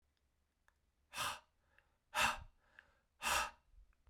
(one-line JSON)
{"exhalation_length": "4.1 s", "exhalation_amplitude": 2860, "exhalation_signal_mean_std_ratio": 0.34, "survey_phase": "beta (2021-08-13 to 2022-03-07)", "age": "18-44", "gender": "Male", "wearing_mask": "No", "symptom_none": true, "smoker_status": "Never smoked", "respiratory_condition_asthma": false, "respiratory_condition_other": false, "recruitment_source": "REACT", "submission_delay": "3 days", "covid_test_result": "Negative", "covid_test_method": "RT-qPCR", "influenza_a_test_result": "Negative", "influenza_b_test_result": "Negative"}